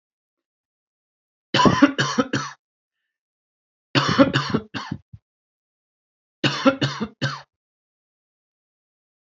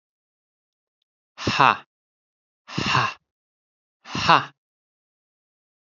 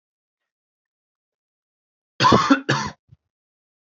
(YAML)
three_cough_length: 9.3 s
three_cough_amplitude: 27280
three_cough_signal_mean_std_ratio: 0.33
exhalation_length: 5.9 s
exhalation_amplitude: 29529
exhalation_signal_mean_std_ratio: 0.26
cough_length: 3.8 s
cough_amplitude: 27802
cough_signal_mean_std_ratio: 0.29
survey_phase: alpha (2021-03-01 to 2021-08-12)
age: 18-44
gender: Male
wearing_mask: 'No'
symptom_fatigue: true
symptom_onset: 4 days
smoker_status: Never smoked
respiratory_condition_asthma: false
respiratory_condition_other: false
recruitment_source: REACT
submission_delay: 1 day
covid_test_result: Negative
covid_test_method: RT-qPCR